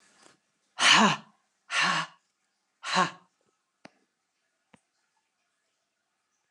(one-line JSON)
{"exhalation_length": "6.5 s", "exhalation_amplitude": 15624, "exhalation_signal_mean_std_ratio": 0.29, "survey_phase": "beta (2021-08-13 to 2022-03-07)", "age": "45-64", "gender": "Female", "wearing_mask": "No", "symptom_cough_any": true, "symptom_runny_or_blocked_nose": true, "symptom_shortness_of_breath": true, "symptom_diarrhoea": true, "symptom_fatigue": true, "symptom_fever_high_temperature": true, "symptom_headache": true, "smoker_status": "Ex-smoker", "respiratory_condition_asthma": false, "respiratory_condition_other": false, "recruitment_source": "Test and Trace", "submission_delay": "3 days", "covid_test_result": "Positive", "covid_test_method": "LFT"}